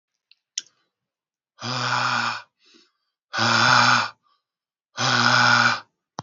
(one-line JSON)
{"exhalation_length": "6.2 s", "exhalation_amplitude": 25090, "exhalation_signal_mean_std_ratio": 0.5, "survey_phase": "beta (2021-08-13 to 2022-03-07)", "age": "18-44", "gender": "Male", "wearing_mask": "No", "symptom_shortness_of_breath": true, "symptom_headache": true, "smoker_status": "Current smoker (11 or more cigarettes per day)", "respiratory_condition_asthma": true, "respiratory_condition_other": false, "recruitment_source": "Test and Trace", "submission_delay": "1 day", "covid_test_result": "Positive", "covid_test_method": "LFT"}